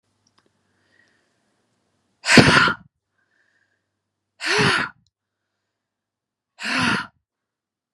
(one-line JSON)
{"exhalation_length": "7.9 s", "exhalation_amplitude": 32768, "exhalation_signal_mean_std_ratio": 0.29, "survey_phase": "beta (2021-08-13 to 2022-03-07)", "age": "18-44", "gender": "Female", "wearing_mask": "No", "symptom_cough_any": true, "symptom_runny_or_blocked_nose": true, "symptom_change_to_sense_of_smell_or_taste": true, "symptom_loss_of_taste": true, "symptom_onset": "7 days", "smoker_status": "Never smoked", "respiratory_condition_asthma": false, "respiratory_condition_other": false, "recruitment_source": "Test and Trace", "submission_delay": "2 days", "covid_test_result": "Positive", "covid_test_method": "RT-qPCR"}